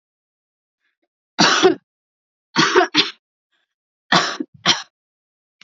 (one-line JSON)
{"three_cough_length": "5.6 s", "three_cough_amplitude": 32767, "three_cough_signal_mean_std_ratio": 0.35, "survey_phase": "alpha (2021-03-01 to 2021-08-12)", "age": "18-44", "gender": "Female", "wearing_mask": "No", "symptom_headache": true, "smoker_status": "Never smoked", "respiratory_condition_asthma": false, "respiratory_condition_other": false, "recruitment_source": "Test and Trace", "submission_delay": "2 days", "covid_test_result": "Positive", "covid_test_method": "RT-qPCR"}